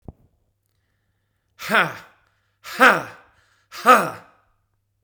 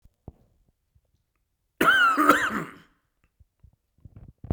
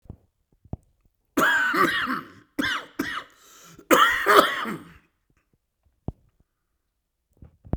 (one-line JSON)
{"exhalation_length": "5.0 s", "exhalation_amplitude": 32767, "exhalation_signal_mean_std_ratio": 0.28, "cough_length": "4.5 s", "cough_amplitude": 23055, "cough_signal_mean_std_ratio": 0.35, "three_cough_length": "7.8 s", "three_cough_amplitude": 32767, "three_cough_signal_mean_std_ratio": 0.4, "survey_phase": "beta (2021-08-13 to 2022-03-07)", "age": "45-64", "gender": "Male", "wearing_mask": "No", "symptom_cough_any": true, "symptom_shortness_of_breath": true, "symptom_change_to_sense_of_smell_or_taste": true, "symptom_onset": "12 days", "smoker_status": "Ex-smoker", "respiratory_condition_asthma": false, "respiratory_condition_other": false, "recruitment_source": "REACT", "submission_delay": "3 days", "covid_test_result": "Negative", "covid_test_method": "RT-qPCR"}